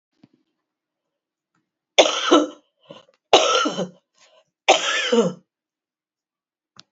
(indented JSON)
{
  "three_cough_length": "6.9 s",
  "three_cough_amplitude": 32768,
  "three_cough_signal_mean_std_ratio": 0.34,
  "survey_phase": "beta (2021-08-13 to 2022-03-07)",
  "age": "65+",
  "gender": "Female",
  "wearing_mask": "No",
  "symptom_cough_any": true,
  "smoker_status": "Never smoked",
  "respiratory_condition_asthma": true,
  "respiratory_condition_other": false,
  "recruitment_source": "Test and Trace",
  "submission_delay": "0 days",
  "covid_test_result": "Negative",
  "covid_test_method": "LFT"
}